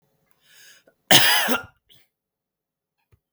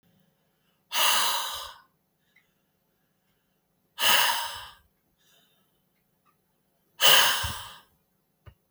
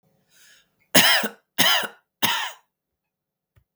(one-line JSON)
{"cough_length": "3.3 s", "cough_amplitude": 32768, "cough_signal_mean_std_ratio": 0.29, "exhalation_length": "8.7 s", "exhalation_amplitude": 24291, "exhalation_signal_mean_std_ratio": 0.34, "three_cough_length": "3.8 s", "three_cough_amplitude": 32766, "three_cough_signal_mean_std_ratio": 0.36, "survey_phase": "beta (2021-08-13 to 2022-03-07)", "age": "18-44", "gender": "Male", "wearing_mask": "No", "symptom_none": true, "smoker_status": "Never smoked", "respiratory_condition_asthma": true, "respiratory_condition_other": false, "recruitment_source": "REACT", "submission_delay": "1 day", "covid_test_result": "Negative", "covid_test_method": "RT-qPCR"}